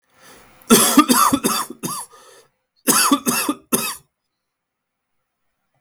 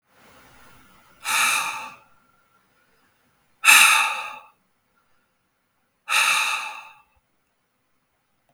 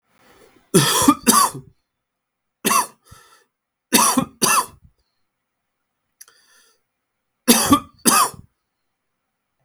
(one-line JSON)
{"cough_length": "5.8 s", "cough_amplitude": 32768, "cough_signal_mean_std_ratio": 0.42, "exhalation_length": "8.5 s", "exhalation_amplitude": 32766, "exhalation_signal_mean_std_ratio": 0.33, "three_cough_length": "9.6 s", "three_cough_amplitude": 32768, "three_cough_signal_mean_std_ratio": 0.35, "survey_phase": "beta (2021-08-13 to 2022-03-07)", "age": "18-44", "gender": "Male", "wearing_mask": "No", "symptom_cough_any": true, "symptom_runny_or_blocked_nose": true, "symptom_sore_throat": true, "symptom_headache": true, "symptom_onset": "4 days", "smoker_status": "Never smoked", "respiratory_condition_asthma": false, "respiratory_condition_other": false, "recruitment_source": "Test and Trace", "submission_delay": "3 days", "covid_test_result": "Positive", "covid_test_method": "ePCR"}